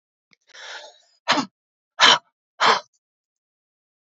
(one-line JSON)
{"exhalation_length": "4.0 s", "exhalation_amplitude": 28760, "exhalation_signal_mean_std_ratio": 0.28, "survey_phase": "beta (2021-08-13 to 2022-03-07)", "age": "45-64", "gender": "Female", "wearing_mask": "No", "symptom_runny_or_blocked_nose": true, "symptom_fatigue": true, "symptom_headache": true, "symptom_onset": "4 days", "smoker_status": "Ex-smoker", "respiratory_condition_asthma": true, "respiratory_condition_other": false, "recruitment_source": "Test and Trace", "submission_delay": "1 day", "covid_test_result": "Positive", "covid_test_method": "RT-qPCR", "covid_ct_value": 18.9, "covid_ct_gene": "ORF1ab gene", "covid_ct_mean": 19.2, "covid_viral_load": "500000 copies/ml", "covid_viral_load_category": "Low viral load (10K-1M copies/ml)"}